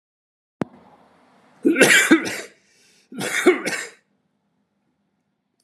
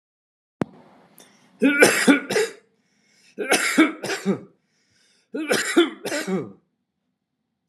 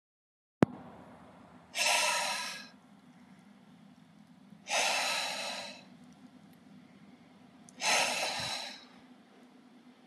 {
  "cough_length": "5.6 s",
  "cough_amplitude": 32767,
  "cough_signal_mean_std_ratio": 0.34,
  "three_cough_length": "7.7 s",
  "three_cough_amplitude": 31593,
  "three_cough_signal_mean_std_ratio": 0.42,
  "exhalation_length": "10.1 s",
  "exhalation_amplitude": 15731,
  "exhalation_signal_mean_std_ratio": 0.46,
  "survey_phase": "alpha (2021-03-01 to 2021-08-12)",
  "age": "18-44",
  "gender": "Male",
  "wearing_mask": "No",
  "symptom_none": true,
  "smoker_status": "Never smoked",
  "respiratory_condition_asthma": false,
  "respiratory_condition_other": false,
  "recruitment_source": "REACT",
  "submission_delay": "2 days",
  "covid_test_result": "Negative",
  "covid_test_method": "RT-qPCR"
}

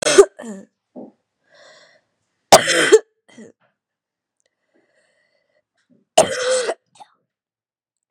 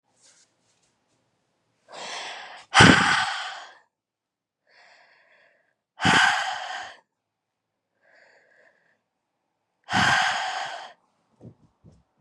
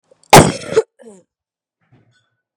{
  "three_cough_length": "8.1 s",
  "three_cough_amplitude": 32768,
  "three_cough_signal_mean_std_ratio": 0.26,
  "exhalation_length": "12.2 s",
  "exhalation_amplitude": 32768,
  "exhalation_signal_mean_std_ratio": 0.32,
  "cough_length": "2.6 s",
  "cough_amplitude": 32768,
  "cough_signal_mean_std_ratio": 0.26,
  "survey_phase": "beta (2021-08-13 to 2022-03-07)",
  "age": "18-44",
  "gender": "Female",
  "wearing_mask": "No",
  "symptom_new_continuous_cough": true,
  "symptom_runny_or_blocked_nose": true,
  "symptom_fatigue": true,
  "symptom_headache": true,
  "smoker_status": "Never smoked",
  "respiratory_condition_asthma": false,
  "respiratory_condition_other": false,
  "recruitment_source": "Test and Trace",
  "submission_delay": "2 days",
  "covid_test_result": "Positive",
  "covid_test_method": "LFT"
}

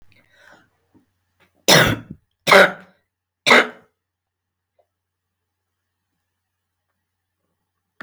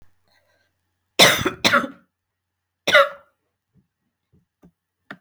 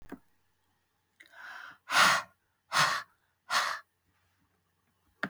{
  "three_cough_length": "8.0 s",
  "three_cough_amplitude": 32768,
  "three_cough_signal_mean_std_ratio": 0.23,
  "cough_length": "5.2 s",
  "cough_amplitude": 32768,
  "cough_signal_mean_std_ratio": 0.27,
  "exhalation_length": "5.3 s",
  "exhalation_amplitude": 10791,
  "exhalation_signal_mean_std_ratio": 0.33,
  "survey_phase": "beta (2021-08-13 to 2022-03-07)",
  "age": "45-64",
  "gender": "Female",
  "wearing_mask": "No",
  "symptom_sore_throat": true,
  "symptom_onset": "12 days",
  "smoker_status": "Current smoker (11 or more cigarettes per day)",
  "respiratory_condition_asthma": false,
  "respiratory_condition_other": false,
  "recruitment_source": "REACT",
  "submission_delay": "3 days",
  "covid_test_result": "Negative",
  "covid_test_method": "RT-qPCR",
  "influenza_a_test_result": "Negative",
  "influenza_b_test_result": "Negative"
}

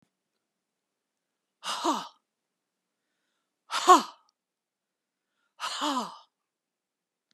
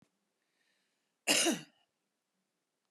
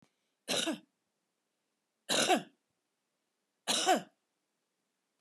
{
  "exhalation_length": "7.3 s",
  "exhalation_amplitude": 19591,
  "exhalation_signal_mean_std_ratio": 0.22,
  "cough_length": "2.9 s",
  "cough_amplitude": 6774,
  "cough_signal_mean_std_ratio": 0.26,
  "three_cough_length": "5.2 s",
  "three_cough_amplitude": 6051,
  "three_cough_signal_mean_std_ratio": 0.32,
  "survey_phase": "beta (2021-08-13 to 2022-03-07)",
  "age": "65+",
  "gender": "Female",
  "wearing_mask": "No",
  "symptom_none": true,
  "smoker_status": "Ex-smoker",
  "respiratory_condition_asthma": false,
  "respiratory_condition_other": false,
  "recruitment_source": "REACT",
  "submission_delay": "1 day",
  "covid_test_result": "Negative",
  "covid_test_method": "RT-qPCR"
}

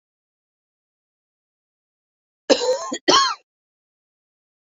{
  "three_cough_length": "4.6 s",
  "three_cough_amplitude": 27668,
  "three_cough_signal_mean_std_ratio": 0.28,
  "survey_phase": "beta (2021-08-13 to 2022-03-07)",
  "age": "45-64",
  "gender": "Female",
  "wearing_mask": "No",
  "symptom_cough_any": true,
  "symptom_runny_or_blocked_nose": true,
  "symptom_sore_throat": true,
  "symptom_fatigue": true,
  "symptom_fever_high_temperature": true,
  "symptom_headache": true,
  "symptom_change_to_sense_of_smell_or_taste": true,
  "symptom_loss_of_taste": true,
  "symptom_onset": "4 days",
  "smoker_status": "Ex-smoker",
  "respiratory_condition_asthma": false,
  "respiratory_condition_other": false,
  "recruitment_source": "Test and Trace",
  "submission_delay": "2 days",
  "covid_test_result": "Positive",
  "covid_test_method": "RT-qPCR",
  "covid_ct_value": 20.7,
  "covid_ct_gene": "ORF1ab gene"
}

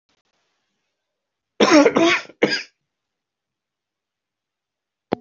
{
  "cough_length": "5.2 s",
  "cough_amplitude": 25803,
  "cough_signal_mean_std_ratio": 0.29,
  "survey_phase": "beta (2021-08-13 to 2022-03-07)",
  "age": "65+",
  "gender": "Male",
  "wearing_mask": "No",
  "symptom_cough_any": true,
  "symptom_onset": "2 days",
  "smoker_status": "Never smoked",
  "respiratory_condition_asthma": false,
  "respiratory_condition_other": false,
  "recruitment_source": "Test and Trace",
  "submission_delay": "2 days",
  "covid_test_result": "Positive",
  "covid_test_method": "RT-qPCR",
  "covid_ct_value": 22.7,
  "covid_ct_gene": "ORF1ab gene",
  "covid_ct_mean": 23.1,
  "covid_viral_load": "26000 copies/ml",
  "covid_viral_load_category": "Low viral load (10K-1M copies/ml)"
}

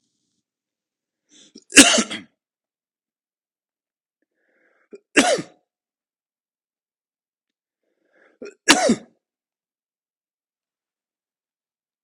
{
  "three_cough_length": "12.0 s",
  "three_cough_amplitude": 32768,
  "three_cough_signal_mean_std_ratio": 0.18,
  "survey_phase": "beta (2021-08-13 to 2022-03-07)",
  "age": "45-64",
  "gender": "Male",
  "wearing_mask": "No",
  "symptom_cough_any": true,
  "symptom_runny_or_blocked_nose": true,
  "symptom_sore_throat": true,
  "symptom_fatigue": true,
  "symptom_fever_high_temperature": true,
  "symptom_headache": true,
  "smoker_status": "Ex-smoker",
  "respiratory_condition_asthma": false,
  "respiratory_condition_other": false,
  "recruitment_source": "Test and Trace",
  "submission_delay": "3 days",
  "covid_test_result": "Negative",
  "covid_test_method": "RT-qPCR"
}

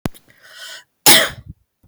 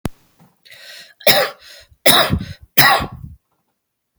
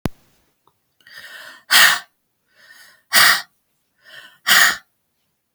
{
  "cough_length": "1.9 s",
  "cough_amplitude": 32768,
  "cough_signal_mean_std_ratio": 0.31,
  "three_cough_length": "4.2 s",
  "three_cough_amplitude": 32768,
  "three_cough_signal_mean_std_ratio": 0.38,
  "exhalation_length": "5.5 s",
  "exhalation_amplitude": 32768,
  "exhalation_signal_mean_std_ratio": 0.33,
  "survey_phase": "beta (2021-08-13 to 2022-03-07)",
  "age": "45-64",
  "gender": "Female",
  "wearing_mask": "No",
  "symptom_cough_any": true,
  "symptom_runny_or_blocked_nose": true,
  "symptom_sore_throat": true,
  "symptom_diarrhoea": true,
  "symptom_fatigue": true,
  "symptom_headache": true,
  "symptom_other": true,
  "symptom_onset": "3 days",
  "smoker_status": "Never smoked",
  "respiratory_condition_asthma": false,
  "respiratory_condition_other": false,
  "recruitment_source": "Test and Trace",
  "submission_delay": "2 days",
  "covid_test_result": "Positive",
  "covid_test_method": "RT-qPCR",
  "covid_ct_value": 23.3,
  "covid_ct_gene": "ORF1ab gene",
  "covid_ct_mean": 24.6,
  "covid_viral_load": "8800 copies/ml",
  "covid_viral_load_category": "Minimal viral load (< 10K copies/ml)"
}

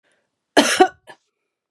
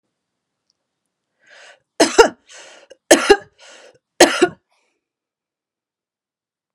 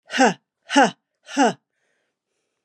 {
  "cough_length": "1.7 s",
  "cough_amplitude": 32767,
  "cough_signal_mean_std_ratio": 0.3,
  "three_cough_length": "6.7 s",
  "three_cough_amplitude": 32768,
  "three_cough_signal_mean_std_ratio": 0.23,
  "exhalation_length": "2.6 s",
  "exhalation_amplitude": 24178,
  "exhalation_signal_mean_std_ratio": 0.35,
  "survey_phase": "beta (2021-08-13 to 2022-03-07)",
  "age": "45-64",
  "gender": "Female",
  "wearing_mask": "No",
  "symptom_runny_or_blocked_nose": true,
  "symptom_sore_throat": true,
  "smoker_status": "Never smoked",
  "respiratory_condition_asthma": false,
  "respiratory_condition_other": false,
  "recruitment_source": "REACT",
  "submission_delay": "0 days",
  "covid_test_result": "Negative",
  "covid_test_method": "RT-qPCR",
  "influenza_a_test_result": "Negative",
  "influenza_b_test_result": "Negative"
}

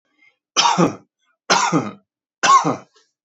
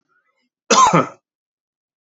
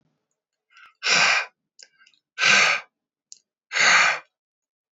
{
  "three_cough_length": "3.2 s",
  "three_cough_amplitude": 30701,
  "three_cough_signal_mean_std_ratio": 0.46,
  "cough_length": "2.0 s",
  "cough_amplitude": 30069,
  "cough_signal_mean_std_ratio": 0.33,
  "exhalation_length": "4.9 s",
  "exhalation_amplitude": 19917,
  "exhalation_signal_mean_std_ratio": 0.42,
  "survey_phase": "beta (2021-08-13 to 2022-03-07)",
  "age": "18-44",
  "gender": "Male",
  "wearing_mask": "No",
  "symptom_shortness_of_breath": true,
  "smoker_status": "Never smoked",
  "respiratory_condition_asthma": false,
  "respiratory_condition_other": false,
  "recruitment_source": "REACT",
  "submission_delay": "2 days",
  "covid_test_result": "Negative",
  "covid_test_method": "RT-qPCR",
  "influenza_a_test_result": "Unknown/Void",
  "influenza_b_test_result": "Unknown/Void"
}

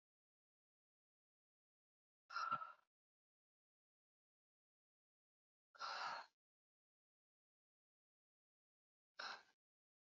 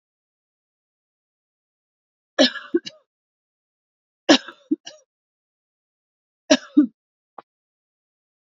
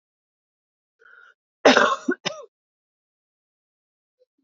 {
  "exhalation_length": "10.2 s",
  "exhalation_amplitude": 843,
  "exhalation_signal_mean_std_ratio": 0.24,
  "three_cough_length": "8.5 s",
  "three_cough_amplitude": 28704,
  "three_cough_signal_mean_std_ratio": 0.18,
  "cough_length": "4.4 s",
  "cough_amplitude": 27871,
  "cough_signal_mean_std_ratio": 0.22,
  "survey_phase": "beta (2021-08-13 to 2022-03-07)",
  "age": "18-44",
  "gender": "Female",
  "wearing_mask": "No",
  "symptom_cough_any": true,
  "symptom_runny_or_blocked_nose": true,
  "symptom_sore_throat": true,
  "symptom_change_to_sense_of_smell_or_taste": true,
  "symptom_loss_of_taste": true,
  "symptom_onset": "5 days",
  "smoker_status": "Never smoked",
  "respiratory_condition_asthma": false,
  "respiratory_condition_other": false,
  "recruitment_source": "Test and Trace",
  "submission_delay": "1 day",
  "covid_test_result": "Positive",
  "covid_test_method": "RT-qPCR",
  "covid_ct_value": 21.7,
  "covid_ct_gene": "S gene"
}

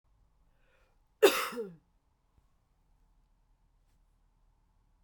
{
  "cough_length": "5.0 s",
  "cough_amplitude": 11660,
  "cough_signal_mean_std_ratio": 0.18,
  "survey_phase": "beta (2021-08-13 to 2022-03-07)",
  "age": "18-44",
  "gender": "Female",
  "wearing_mask": "No",
  "symptom_cough_any": true,
  "symptom_runny_or_blocked_nose": true,
  "symptom_sore_throat": true,
  "symptom_fatigue": true,
  "symptom_change_to_sense_of_smell_or_taste": true,
  "symptom_onset": "3 days",
  "smoker_status": "Never smoked",
  "respiratory_condition_asthma": false,
  "respiratory_condition_other": false,
  "recruitment_source": "Test and Trace",
  "submission_delay": "2 days",
  "covid_test_result": "Positive",
  "covid_test_method": "RT-qPCR"
}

